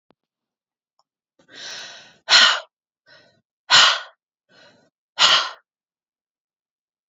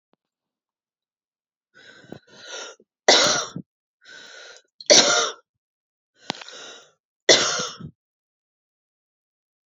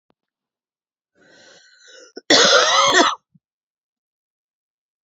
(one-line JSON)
{"exhalation_length": "7.1 s", "exhalation_amplitude": 32690, "exhalation_signal_mean_std_ratio": 0.28, "three_cough_length": "9.7 s", "three_cough_amplitude": 31461, "three_cough_signal_mean_std_ratio": 0.27, "cough_length": "5.0 s", "cough_amplitude": 28966, "cough_signal_mean_std_ratio": 0.34, "survey_phase": "beta (2021-08-13 to 2022-03-07)", "age": "18-44", "gender": "Female", "wearing_mask": "No", "symptom_cough_any": true, "symptom_runny_or_blocked_nose": true, "symptom_fatigue": true, "symptom_onset": "8 days", "smoker_status": "Never smoked", "respiratory_condition_asthma": false, "respiratory_condition_other": false, "recruitment_source": "REACT", "submission_delay": "1 day", "covid_test_result": "Positive", "covid_test_method": "RT-qPCR", "covid_ct_value": 25.7, "covid_ct_gene": "E gene", "influenza_a_test_result": "Negative", "influenza_b_test_result": "Negative"}